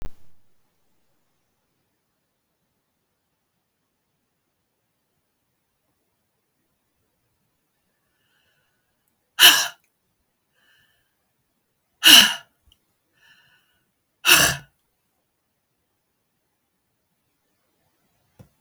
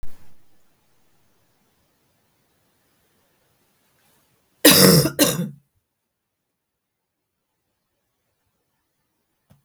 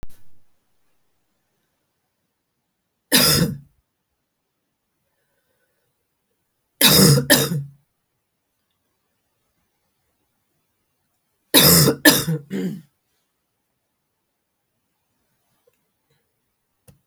{"exhalation_length": "18.6 s", "exhalation_amplitude": 32768, "exhalation_signal_mean_std_ratio": 0.16, "cough_length": "9.6 s", "cough_amplitude": 32768, "cough_signal_mean_std_ratio": 0.23, "three_cough_length": "17.1 s", "three_cough_amplitude": 32495, "three_cough_signal_mean_std_ratio": 0.27, "survey_phase": "beta (2021-08-13 to 2022-03-07)", "age": "45-64", "gender": "Female", "wearing_mask": "No", "symptom_cough_any": true, "symptom_runny_or_blocked_nose": true, "symptom_sore_throat": true, "symptom_headache": true, "smoker_status": "Never smoked", "respiratory_condition_asthma": false, "respiratory_condition_other": false, "recruitment_source": "Test and Trace", "submission_delay": "2 days", "covid_test_result": "Positive", "covid_test_method": "LFT"}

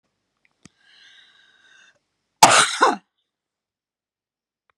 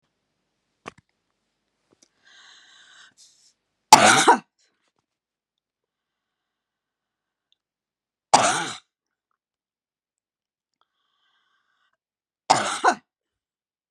{"cough_length": "4.8 s", "cough_amplitude": 32768, "cough_signal_mean_std_ratio": 0.23, "three_cough_length": "13.9 s", "three_cough_amplitude": 32768, "three_cough_signal_mean_std_ratio": 0.19, "survey_phase": "beta (2021-08-13 to 2022-03-07)", "age": "65+", "gender": "Female", "wearing_mask": "No", "symptom_none": true, "smoker_status": "Ex-smoker", "respiratory_condition_asthma": false, "respiratory_condition_other": false, "recruitment_source": "REACT", "submission_delay": "1 day", "covid_test_result": "Negative", "covid_test_method": "RT-qPCR"}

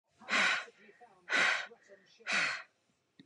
{"exhalation_length": "3.3 s", "exhalation_amplitude": 4560, "exhalation_signal_mean_std_ratio": 0.48, "survey_phase": "beta (2021-08-13 to 2022-03-07)", "age": "18-44", "gender": "Female", "wearing_mask": "No", "symptom_none": true, "smoker_status": "Ex-smoker", "respiratory_condition_asthma": false, "respiratory_condition_other": false, "recruitment_source": "REACT", "submission_delay": "1 day", "covid_test_result": "Negative", "covid_test_method": "RT-qPCR", "influenza_a_test_result": "Negative", "influenza_b_test_result": "Negative"}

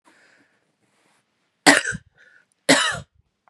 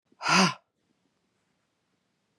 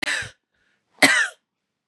{"cough_length": "3.5 s", "cough_amplitude": 32767, "cough_signal_mean_std_ratio": 0.27, "exhalation_length": "2.4 s", "exhalation_amplitude": 13250, "exhalation_signal_mean_std_ratio": 0.27, "three_cough_length": "1.9 s", "three_cough_amplitude": 30997, "three_cough_signal_mean_std_ratio": 0.36, "survey_phase": "beta (2021-08-13 to 2022-03-07)", "age": "45-64", "gender": "Female", "wearing_mask": "No", "symptom_none": true, "smoker_status": "Never smoked", "respiratory_condition_asthma": false, "respiratory_condition_other": false, "recruitment_source": "REACT", "submission_delay": "2 days", "covid_test_result": "Negative", "covid_test_method": "RT-qPCR", "influenza_a_test_result": "Negative", "influenza_b_test_result": "Negative"}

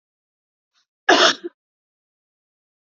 {"cough_length": "2.9 s", "cough_amplitude": 30107, "cough_signal_mean_std_ratio": 0.24, "survey_phase": "beta (2021-08-13 to 2022-03-07)", "age": "45-64", "gender": "Female", "wearing_mask": "No", "symptom_none": true, "smoker_status": "Never smoked", "respiratory_condition_asthma": false, "respiratory_condition_other": false, "recruitment_source": "REACT", "submission_delay": "2 days", "covid_test_result": "Negative", "covid_test_method": "RT-qPCR", "influenza_a_test_result": "Negative", "influenza_b_test_result": "Negative"}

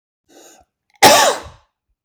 {"cough_length": "2.0 s", "cough_amplitude": 32768, "cough_signal_mean_std_ratio": 0.34, "survey_phase": "beta (2021-08-13 to 2022-03-07)", "age": "18-44", "gender": "Male", "wearing_mask": "No", "symptom_none": true, "smoker_status": "Never smoked", "respiratory_condition_asthma": false, "respiratory_condition_other": false, "recruitment_source": "REACT", "submission_delay": "1 day", "covid_test_result": "Negative", "covid_test_method": "RT-qPCR", "influenza_a_test_result": "Unknown/Void", "influenza_b_test_result": "Unknown/Void"}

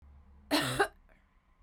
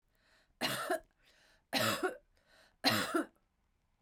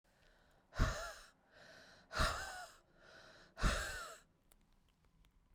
{"cough_length": "1.6 s", "cough_amplitude": 6172, "cough_signal_mean_std_ratio": 0.4, "three_cough_length": "4.0 s", "three_cough_amplitude": 6302, "three_cough_signal_mean_std_ratio": 0.43, "exhalation_length": "5.5 s", "exhalation_amplitude": 3050, "exhalation_signal_mean_std_ratio": 0.38, "survey_phase": "beta (2021-08-13 to 2022-03-07)", "age": "45-64", "gender": "Female", "wearing_mask": "No", "symptom_cough_any": true, "symptom_runny_or_blocked_nose": true, "symptom_sore_throat": true, "symptom_fatigue": true, "symptom_fever_high_temperature": true, "symptom_headache": true, "smoker_status": "Ex-smoker", "respiratory_condition_asthma": false, "respiratory_condition_other": false, "recruitment_source": "Test and Trace", "submission_delay": "2 days", "covid_test_result": "Positive", "covid_test_method": "ePCR"}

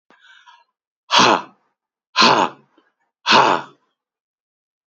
{"exhalation_length": "4.9 s", "exhalation_amplitude": 31759, "exhalation_signal_mean_std_ratio": 0.35, "survey_phase": "beta (2021-08-13 to 2022-03-07)", "age": "45-64", "gender": "Male", "wearing_mask": "No", "symptom_none": true, "smoker_status": "Ex-smoker", "respiratory_condition_asthma": false, "respiratory_condition_other": false, "recruitment_source": "REACT", "submission_delay": "1 day", "covid_test_result": "Negative", "covid_test_method": "RT-qPCR", "influenza_a_test_result": "Negative", "influenza_b_test_result": "Negative"}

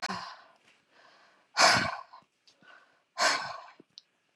{"exhalation_length": "4.4 s", "exhalation_amplitude": 15798, "exhalation_signal_mean_std_ratio": 0.34, "survey_phase": "beta (2021-08-13 to 2022-03-07)", "age": "45-64", "gender": "Female", "wearing_mask": "No", "symptom_sore_throat": true, "symptom_fatigue": true, "symptom_headache": true, "symptom_other": true, "smoker_status": "Never smoked", "respiratory_condition_asthma": false, "respiratory_condition_other": false, "recruitment_source": "Test and Trace", "submission_delay": "1 day", "covid_test_result": "Positive", "covid_test_method": "RT-qPCR", "covid_ct_value": 38.5, "covid_ct_gene": "N gene"}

